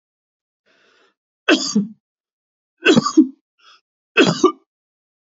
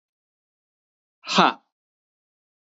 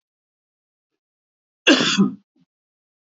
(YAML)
three_cough_length: 5.3 s
three_cough_amplitude: 28161
three_cough_signal_mean_std_ratio: 0.32
exhalation_length: 2.6 s
exhalation_amplitude: 27143
exhalation_signal_mean_std_ratio: 0.2
cough_length: 3.2 s
cough_amplitude: 27889
cough_signal_mean_std_ratio: 0.28
survey_phase: beta (2021-08-13 to 2022-03-07)
age: 18-44
gender: Male
wearing_mask: 'No'
symptom_none: true
smoker_status: Never smoked
respiratory_condition_asthma: false
respiratory_condition_other: false
recruitment_source: REACT
submission_delay: 0 days
covid_test_result: Negative
covid_test_method: RT-qPCR
influenza_a_test_result: Negative
influenza_b_test_result: Negative